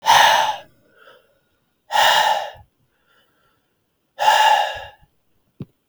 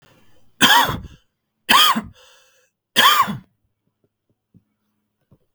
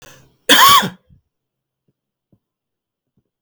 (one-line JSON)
{"exhalation_length": "5.9 s", "exhalation_amplitude": 31526, "exhalation_signal_mean_std_ratio": 0.44, "three_cough_length": "5.5 s", "three_cough_amplitude": 32768, "three_cough_signal_mean_std_ratio": 0.35, "cough_length": "3.4 s", "cough_amplitude": 32768, "cough_signal_mean_std_ratio": 0.28, "survey_phase": "beta (2021-08-13 to 2022-03-07)", "age": "18-44", "gender": "Male", "wearing_mask": "No", "symptom_runny_or_blocked_nose": true, "symptom_fatigue": true, "symptom_headache": true, "smoker_status": "Never smoked", "respiratory_condition_asthma": true, "respiratory_condition_other": false, "recruitment_source": "Test and Trace", "submission_delay": "1 day", "covid_test_result": "Positive", "covid_test_method": "RT-qPCR", "covid_ct_value": 29.3, "covid_ct_gene": "ORF1ab gene"}